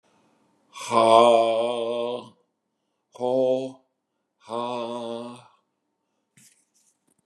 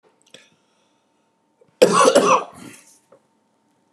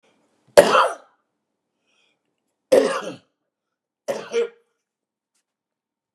{"exhalation_length": "7.3 s", "exhalation_amplitude": 25750, "exhalation_signal_mean_std_ratio": 0.42, "cough_length": "3.9 s", "cough_amplitude": 32767, "cough_signal_mean_std_ratio": 0.32, "three_cough_length": "6.1 s", "three_cough_amplitude": 32768, "three_cough_signal_mean_std_ratio": 0.26, "survey_phase": "beta (2021-08-13 to 2022-03-07)", "age": "45-64", "gender": "Male", "wearing_mask": "No", "symptom_none": true, "smoker_status": "Never smoked", "respiratory_condition_asthma": false, "respiratory_condition_other": false, "recruitment_source": "REACT", "submission_delay": "3 days", "covid_test_result": "Negative", "covid_test_method": "RT-qPCR", "influenza_a_test_result": "Negative", "influenza_b_test_result": "Negative"}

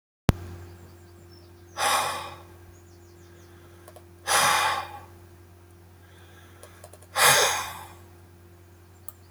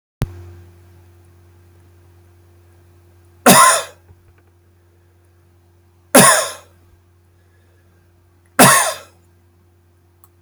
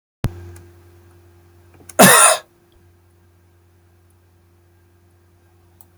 {"exhalation_length": "9.3 s", "exhalation_amplitude": 24551, "exhalation_signal_mean_std_ratio": 0.39, "three_cough_length": "10.4 s", "three_cough_amplitude": 32768, "three_cough_signal_mean_std_ratio": 0.27, "cough_length": "6.0 s", "cough_amplitude": 32768, "cough_signal_mean_std_ratio": 0.24, "survey_phase": "alpha (2021-03-01 to 2021-08-12)", "age": "65+", "gender": "Male", "wearing_mask": "No", "symptom_diarrhoea": true, "symptom_onset": "12 days", "smoker_status": "Never smoked", "respiratory_condition_asthma": false, "respiratory_condition_other": false, "recruitment_source": "REACT", "submission_delay": "1 day", "covid_test_result": "Negative", "covid_test_method": "RT-qPCR"}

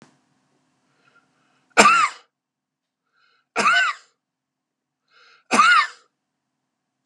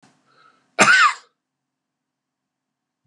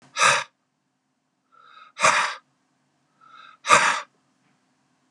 {"three_cough_length": "7.1 s", "three_cough_amplitude": 32768, "three_cough_signal_mean_std_ratio": 0.31, "cough_length": "3.1 s", "cough_amplitude": 32543, "cough_signal_mean_std_ratio": 0.28, "exhalation_length": "5.1 s", "exhalation_amplitude": 30403, "exhalation_signal_mean_std_ratio": 0.33, "survey_phase": "beta (2021-08-13 to 2022-03-07)", "age": "45-64", "gender": "Male", "wearing_mask": "No", "symptom_none": true, "smoker_status": "Never smoked", "respiratory_condition_asthma": false, "respiratory_condition_other": false, "recruitment_source": "REACT", "submission_delay": "2 days", "covid_test_result": "Negative", "covid_test_method": "RT-qPCR", "influenza_a_test_result": "Negative", "influenza_b_test_result": "Negative"}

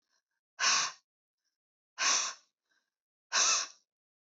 {"exhalation_length": "4.3 s", "exhalation_amplitude": 6417, "exhalation_signal_mean_std_ratio": 0.39, "survey_phase": "beta (2021-08-13 to 2022-03-07)", "age": "18-44", "gender": "Female", "wearing_mask": "No", "symptom_cough_any": true, "symptom_new_continuous_cough": true, "symptom_runny_or_blocked_nose": true, "symptom_sore_throat": true, "symptom_fatigue": true, "symptom_onset": "2 days", "smoker_status": "Never smoked", "respiratory_condition_asthma": false, "respiratory_condition_other": false, "recruitment_source": "Test and Trace", "submission_delay": "2 days", "covid_test_result": "Positive", "covid_test_method": "RT-qPCR", "covid_ct_value": 27.0, "covid_ct_gene": "ORF1ab gene", "covid_ct_mean": 27.3, "covid_viral_load": "1100 copies/ml", "covid_viral_load_category": "Minimal viral load (< 10K copies/ml)"}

